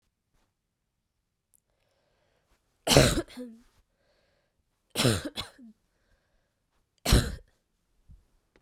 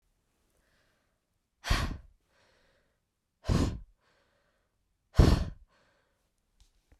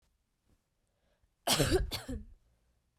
{"three_cough_length": "8.6 s", "three_cough_amplitude": 28838, "three_cough_signal_mean_std_ratio": 0.24, "exhalation_length": "7.0 s", "exhalation_amplitude": 13463, "exhalation_signal_mean_std_ratio": 0.25, "cough_length": "3.0 s", "cough_amplitude": 6352, "cough_signal_mean_std_ratio": 0.35, "survey_phase": "beta (2021-08-13 to 2022-03-07)", "age": "18-44", "gender": "Female", "wearing_mask": "No", "symptom_cough_any": true, "symptom_runny_or_blocked_nose": true, "symptom_shortness_of_breath": true, "symptom_sore_throat": true, "symptom_fatigue": true, "symptom_change_to_sense_of_smell_or_taste": true, "symptom_loss_of_taste": true, "symptom_onset": "4 days", "smoker_status": "Never smoked", "respiratory_condition_asthma": false, "respiratory_condition_other": false, "recruitment_source": "Test and Trace", "submission_delay": "2 days", "covid_test_result": "Positive", "covid_test_method": "RT-qPCR"}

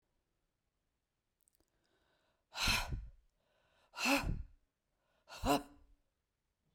{"exhalation_length": "6.7 s", "exhalation_amplitude": 4080, "exhalation_signal_mean_std_ratio": 0.32, "survey_phase": "beta (2021-08-13 to 2022-03-07)", "age": "45-64", "gender": "Female", "wearing_mask": "No", "symptom_none": true, "symptom_onset": "12 days", "smoker_status": "Never smoked", "respiratory_condition_asthma": false, "respiratory_condition_other": false, "recruitment_source": "REACT", "submission_delay": "2 days", "covid_test_result": "Negative", "covid_test_method": "RT-qPCR"}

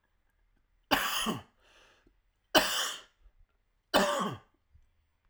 {"three_cough_length": "5.3 s", "three_cough_amplitude": 15682, "three_cough_signal_mean_std_ratio": 0.37, "survey_phase": "alpha (2021-03-01 to 2021-08-12)", "age": "45-64", "gender": "Male", "wearing_mask": "No", "symptom_cough_any": true, "symptom_onset": "2 days", "smoker_status": "Never smoked", "respiratory_condition_asthma": false, "respiratory_condition_other": false, "recruitment_source": "Test and Trace", "submission_delay": "1 day", "covid_test_result": "Positive", "covid_test_method": "RT-qPCR", "covid_ct_value": 16.5, "covid_ct_gene": "ORF1ab gene", "covid_ct_mean": 16.9, "covid_viral_load": "2800000 copies/ml", "covid_viral_load_category": "High viral load (>1M copies/ml)"}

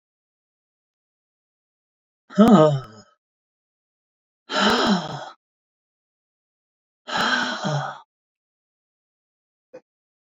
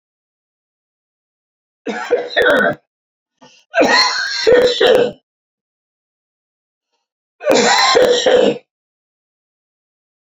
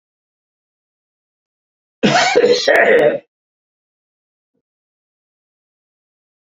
{"exhalation_length": "10.3 s", "exhalation_amplitude": 26329, "exhalation_signal_mean_std_ratio": 0.3, "three_cough_length": "10.2 s", "three_cough_amplitude": 32547, "three_cough_signal_mean_std_ratio": 0.46, "cough_length": "6.5 s", "cough_amplitude": 32768, "cough_signal_mean_std_ratio": 0.34, "survey_phase": "beta (2021-08-13 to 2022-03-07)", "age": "65+", "gender": "Male", "wearing_mask": "No", "symptom_none": true, "smoker_status": "Ex-smoker", "respiratory_condition_asthma": false, "respiratory_condition_other": false, "recruitment_source": "REACT", "submission_delay": "1 day", "covid_test_result": "Negative", "covid_test_method": "RT-qPCR", "influenza_a_test_result": "Negative", "influenza_b_test_result": "Negative"}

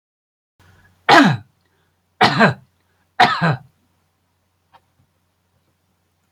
{"three_cough_length": "6.3 s", "three_cough_amplitude": 31856, "three_cough_signal_mean_std_ratio": 0.3, "survey_phase": "beta (2021-08-13 to 2022-03-07)", "age": "65+", "gender": "Male", "wearing_mask": "No", "symptom_none": true, "smoker_status": "Never smoked", "respiratory_condition_asthma": false, "respiratory_condition_other": false, "recruitment_source": "REACT", "submission_delay": "2 days", "covid_test_result": "Negative", "covid_test_method": "RT-qPCR"}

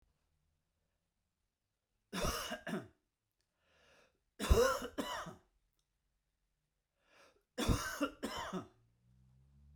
{"three_cough_length": "9.8 s", "three_cough_amplitude": 5027, "three_cough_signal_mean_std_ratio": 0.33, "survey_phase": "beta (2021-08-13 to 2022-03-07)", "age": "45-64", "gender": "Male", "wearing_mask": "No", "symptom_none": true, "smoker_status": "Never smoked", "respiratory_condition_asthma": false, "respiratory_condition_other": false, "recruitment_source": "REACT", "submission_delay": "1 day", "covid_test_result": "Negative", "covid_test_method": "RT-qPCR"}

